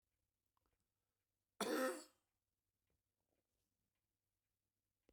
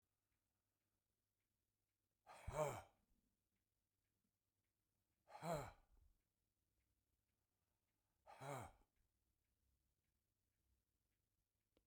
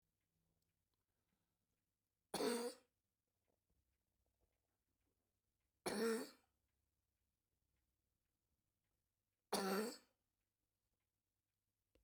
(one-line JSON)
{"cough_length": "5.1 s", "cough_amplitude": 1454, "cough_signal_mean_std_ratio": 0.22, "exhalation_length": "11.9 s", "exhalation_amplitude": 994, "exhalation_signal_mean_std_ratio": 0.23, "three_cough_length": "12.0 s", "three_cough_amplitude": 1181, "three_cough_signal_mean_std_ratio": 0.26, "survey_phase": "beta (2021-08-13 to 2022-03-07)", "age": "65+", "gender": "Male", "wearing_mask": "No", "symptom_cough_any": true, "symptom_runny_or_blocked_nose": true, "symptom_headache": true, "smoker_status": "Ex-smoker", "respiratory_condition_asthma": false, "respiratory_condition_other": true, "recruitment_source": "REACT", "submission_delay": "16 days", "covid_test_result": "Negative", "covid_test_method": "RT-qPCR"}